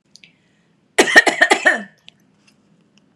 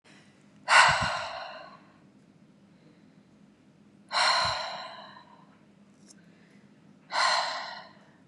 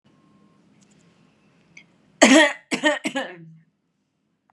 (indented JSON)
{
  "cough_length": "3.2 s",
  "cough_amplitude": 32768,
  "cough_signal_mean_std_ratio": 0.32,
  "exhalation_length": "8.3 s",
  "exhalation_amplitude": 19995,
  "exhalation_signal_mean_std_ratio": 0.38,
  "three_cough_length": "4.5 s",
  "three_cough_amplitude": 32768,
  "three_cough_signal_mean_std_ratio": 0.29,
  "survey_phase": "beta (2021-08-13 to 2022-03-07)",
  "age": "45-64",
  "gender": "Female",
  "wearing_mask": "No",
  "symptom_none": true,
  "smoker_status": "Ex-smoker",
  "respiratory_condition_asthma": false,
  "respiratory_condition_other": false,
  "recruitment_source": "REACT",
  "submission_delay": "2 days",
  "covid_test_result": "Negative",
  "covid_test_method": "RT-qPCR"
}